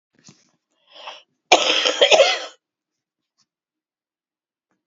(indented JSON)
{
  "cough_length": "4.9 s",
  "cough_amplitude": 32670,
  "cough_signal_mean_std_ratio": 0.31,
  "survey_phase": "beta (2021-08-13 to 2022-03-07)",
  "age": "65+",
  "gender": "Female",
  "wearing_mask": "No",
  "symptom_cough_any": true,
  "smoker_status": "Never smoked",
  "respiratory_condition_asthma": true,
  "respiratory_condition_other": false,
  "recruitment_source": "Test and Trace",
  "submission_delay": "0 days",
  "covid_test_result": "Negative",
  "covid_test_method": "LFT"
}